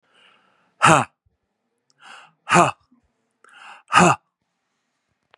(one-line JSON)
{"exhalation_length": "5.4 s", "exhalation_amplitude": 32767, "exhalation_signal_mean_std_ratio": 0.26, "survey_phase": "beta (2021-08-13 to 2022-03-07)", "age": "45-64", "gender": "Male", "wearing_mask": "No", "symptom_runny_or_blocked_nose": true, "symptom_onset": "12 days", "smoker_status": "Ex-smoker", "respiratory_condition_asthma": false, "respiratory_condition_other": false, "recruitment_source": "REACT", "submission_delay": "1 day", "covid_test_result": "Negative", "covid_test_method": "RT-qPCR", "influenza_a_test_result": "Negative", "influenza_b_test_result": "Negative"}